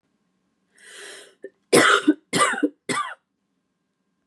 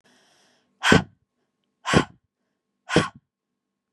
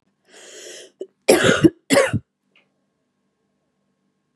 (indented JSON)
{
  "three_cough_length": "4.3 s",
  "three_cough_amplitude": 27252,
  "three_cough_signal_mean_std_ratio": 0.35,
  "exhalation_length": "3.9 s",
  "exhalation_amplitude": 29399,
  "exhalation_signal_mean_std_ratio": 0.26,
  "cough_length": "4.4 s",
  "cough_amplitude": 32765,
  "cough_signal_mean_std_ratio": 0.3,
  "survey_phase": "beta (2021-08-13 to 2022-03-07)",
  "age": "18-44",
  "gender": "Female",
  "wearing_mask": "No",
  "symptom_cough_any": true,
  "symptom_runny_or_blocked_nose": true,
  "symptom_sore_throat": true,
  "symptom_abdominal_pain": true,
  "symptom_diarrhoea": true,
  "symptom_fatigue": true,
  "symptom_headache": true,
  "symptom_change_to_sense_of_smell_or_taste": true,
  "smoker_status": "Never smoked",
  "respiratory_condition_asthma": false,
  "respiratory_condition_other": false,
  "recruitment_source": "Test and Trace",
  "submission_delay": "2 days",
  "covid_test_result": "Positive",
  "covid_test_method": "LFT"
}